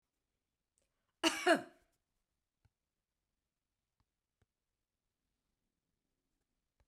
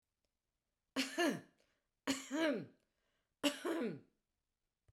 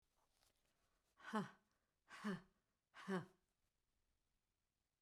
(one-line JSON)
{"cough_length": "6.9 s", "cough_amplitude": 5290, "cough_signal_mean_std_ratio": 0.15, "three_cough_length": "4.9 s", "three_cough_amplitude": 3194, "three_cough_signal_mean_std_ratio": 0.42, "exhalation_length": "5.0 s", "exhalation_amplitude": 897, "exhalation_signal_mean_std_ratio": 0.3, "survey_phase": "beta (2021-08-13 to 2022-03-07)", "age": "45-64", "gender": "Female", "wearing_mask": "No", "symptom_none": true, "smoker_status": "Ex-smoker", "respiratory_condition_asthma": false, "respiratory_condition_other": false, "recruitment_source": "REACT", "submission_delay": "1 day", "covid_test_result": "Negative", "covid_test_method": "RT-qPCR", "influenza_a_test_result": "Negative", "influenza_b_test_result": "Negative"}